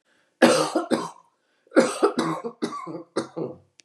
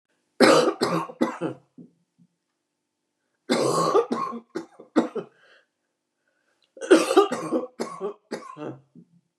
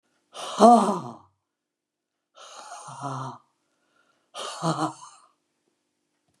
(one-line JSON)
{"cough_length": "3.8 s", "cough_amplitude": 26889, "cough_signal_mean_std_ratio": 0.47, "three_cough_length": "9.4 s", "three_cough_amplitude": 24919, "three_cough_signal_mean_std_ratio": 0.4, "exhalation_length": "6.4 s", "exhalation_amplitude": 25897, "exhalation_signal_mean_std_ratio": 0.28, "survey_phase": "beta (2021-08-13 to 2022-03-07)", "age": "65+", "gender": "Female", "wearing_mask": "No", "symptom_runny_or_blocked_nose": true, "symptom_headache": true, "smoker_status": "Never smoked", "respiratory_condition_asthma": false, "respiratory_condition_other": false, "recruitment_source": "REACT", "submission_delay": "2 days", "covid_test_result": "Negative", "covid_test_method": "RT-qPCR", "influenza_a_test_result": "Negative", "influenza_b_test_result": "Negative"}